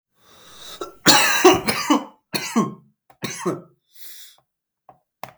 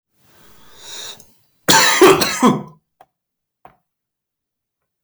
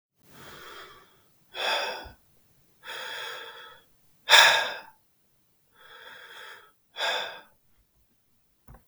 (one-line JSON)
{"three_cough_length": "5.4 s", "three_cough_amplitude": 32768, "three_cough_signal_mean_std_ratio": 0.39, "cough_length": "5.0 s", "cough_amplitude": 32768, "cough_signal_mean_std_ratio": 0.34, "exhalation_length": "8.9 s", "exhalation_amplitude": 32766, "exhalation_signal_mean_std_ratio": 0.29, "survey_phase": "beta (2021-08-13 to 2022-03-07)", "age": "18-44", "gender": "Male", "wearing_mask": "No", "symptom_cough_any": true, "symptom_runny_or_blocked_nose": true, "symptom_shortness_of_breath": true, "symptom_sore_throat": true, "symptom_onset": "2 days", "smoker_status": "Never smoked", "respiratory_condition_asthma": false, "respiratory_condition_other": false, "recruitment_source": "Test and Trace", "submission_delay": "1 day", "covid_test_result": "Positive", "covid_test_method": "RT-qPCR", "covid_ct_value": 34.6, "covid_ct_gene": "ORF1ab gene"}